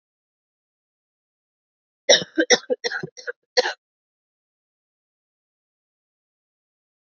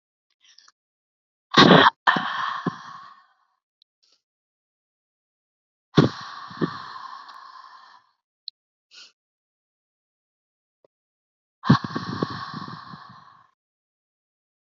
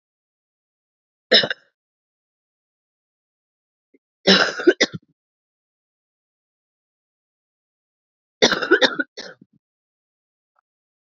{"cough_length": "7.1 s", "cough_amplitude": 28228, "cough_signal_mean_std_ratio": 0.2, "exhalation_length": "14.8 s", "exhalation_amplitude": 28737, "exhalation_signal_mean_std_ratio": 0.24, "three_cough_length": "11.1 s", "three_cough_amplitude": 31133, "three_cough_signal_mean_std_ratio": 0.22, "survey_phase": "alpha (2021-03-01 to 2021-08-12)", "age": "18-44", "gender": "Female", "wearing_mask": "No", "symptom_cough_any": true, "smoker_status": "Never smoked", "respiratory_condition_asthma": false, "respiratory_condition_other": false, "recruitment_source": "Test and Trace", "submission_delay": "2 days", "covid_test_result": "Positive", "covid_test_method": "RT-qPCR", "covid_ct_value": 15.5, "covid_ct_gene": "ORF1ab gene", "covid_ct_mean": 15.8, "covid_viral_load": "6400000 copies/ml", "covid_viral_load_category": "High viral load (>1M copies/ml)"}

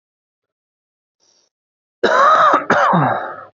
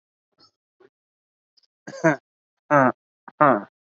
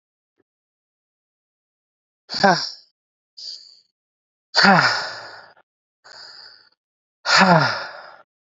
{"cough_length": "3.6 s", "cough_amplitude": 27649, "cough_signal_mean_std_ratio": 0.5, "three_cough_length": "3.9 s", "three_cough_amplitude": 27870, "three_cough_signal_mean_std_ratio": 0.28, "exhalation_length": "8.5 s", "exhalation_amplitude": 27922, "exhalation_signal_mean_std_ratio": 0.32, "survey_phase": "beta (2021-08-13 to 2022-03-07)", "age": "18-44", "gender": "Male", "wearing_mask": "Yes", "symptom_cough_any": true, "symptom_sore_throat": true, "symptom_diarrhoea": true, "symptom_fatigue": true, "symptom_fever_high_temperature": true, "symptom_headache": true, "symptom_change_to_sense_of_smell_or_taste": true, "smoker_status": "Never smoked", "respiratory_condition_asthma": false, "respiratory_condition_other": false, "recruitment_source": "Test and Trace", "submission_delay": "3 days", "covid_test_result": "Positive", "covid_test_method": "LFT"}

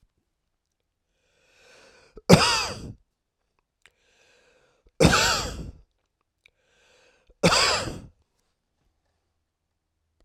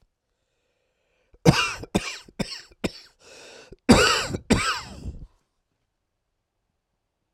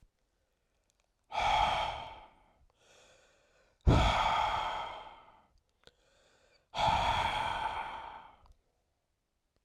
{"three_cough_length": "10.2 s", "three_cough_amplitude": 32768, "three_cough_signal_mean_std_ratio": 0.28, "cough_length": "7.3 s", "cough_amplitude": 31238, "cough_signal_mean_std_ratio": 0.31, "exhalation_length": "9.6 s", "exhalation_amplitude": 6915, "exhalation_signal_mean_std_ratio": 0.46, "survey_phase": "alpha (2021-03-01 to 2021-08-12)", "age": "65+", "gender": "Male", "wearing_mask": "No", "symptom_fever_high_temperature": true, "symptom_headache": true, "smoker_status": "Ex-smoker", "respiratory_condition_asthma": false, "respiratory_condition_other": true, "recruitment_source": "Test and Trace", "submission_delay": "1 day", "covid_test_result": "Positive", "covid_test_method": "RT-qPCR"}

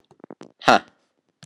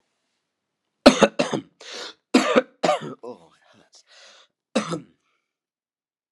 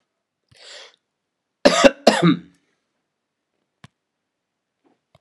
{"exhalation_length": "1.5 s", "exhalation_amplitude": 32767, "exhalation_signal_mean_std_ratio": 0.21, "three_cough_length": "6.3 s", "three_cough_amplitude": 32768, "three_cough_signal_mean_std_ratio": 0.27, "cough_length": "5.2 s", "cough_amplitude": 32768, "cough_signal_mean_std_ratio": 0.23, "survey_phase": "beta (2021-08-13 to 2022-03-07)", "age": "45-64", "gender": "Male", "wearing_mask": "No", "symptom_cough_any": true, "symptom_runny_or_blocked_nose": true, "symptom_shortness_of_breath": true, "symptom_fatigue": true, "symptom_other": true, "smoker_status": "Ex-smoker", "respiratory_condition_asthma": false, "respiratory_condition_other": false, "recruitment_source": "Test and Trace", "submission_delay": "1 day", "covid_test_result": "Positive", "covid_test_method": "RT-qPCR", "covid_ct_value": 20.2, "covid_ct_gene": "ORF1ab gene"}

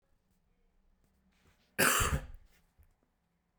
{"cough_length": "3.6 s", "cough_amplitude": 9822, "cough_signal_mean_std_ratio": 0.29, "survey_phase": "beta (2021-08-13 to 2022-03-07)", "age": "18-44", "gender": "Male", "wearing_mask": "No", "symptom_cough_any": true, "symptom_runny_or_blocked_nose": true, "symptom_abdominal_pain": true, "symptom_fatigue": true, "symptom_headache": true, "symptom_other": true, "smoker_status": "Ex-smoker", "respiratory_condition_asthma": false, "respiratory_condition_other": false, "recruitment_source": "Test and Trace", "submission_delay": "2 days", "covid_test_result": "Positive", "covid_test_method": "RT-qPCR", "covid_ct_value": 27.4, "covid_ct_gene": "N gene"}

